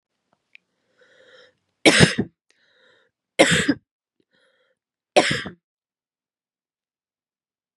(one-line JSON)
{"three_cough_length": "7.8 s", "three_cough_amplitude": 32768, "three_cough_signal_mean_std_ratio": 0.24, "survey_phase": "beta (2021-08-13 to 2022-03-07)", "age": "18-44", "gender": "Female", "wearing_mask": "No", "symptom_cough_any": true, "symptom_runny_or_blocked_nose": true, "symptom_shortness_of_breath": true, "symptom_sore_throat": true, "symptom_fatigue": true, "symptom_headache": true, "symptom_change_to_sense_of_smell_or_taste": true, "symptom_loss_of_taste": true, "symptom_onset": "4 days", "smoker_status": "Never smoked", "respiratory_condition_asthma": false, "respiratory_condition_other": false, "recruitment_source": "Test and Trace", "submission_delay": "1 day", "covid_test_result": "Positive", "covid_test_method": "ePCR"}